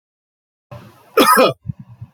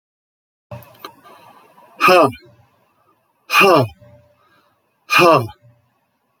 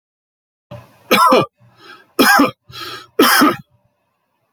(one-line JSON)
{"cough_length": "2.1 s", "cough_amplitude": 31066, "cough_signal_mean_std_ratio": 0.36, "exhalation_length": "6.4 s", "exhalation_amplitude": 29867, "exhalation_signal_mean_std_ratio": 0.34, "three_cough_length": "4.5 s", "three_cough_amplitude": 32340, "three_cough_signal_mean_std_ratio": 0.42, "survey_phase": "beta (2021-08-13 to 2022-03-07)", "age": "65+", "gender": "Male", "wearing_mask": "No", "symptom_none": true, "smoker_status": "Ex-smoker", "respiratory_condition_asthma": false, "respiratory_condition_other": false, "recruitment_source": "REACT", "submission_delay": "2 days", "covid_test_result": "Negative", "covid_test_method": "RT-qPCR"}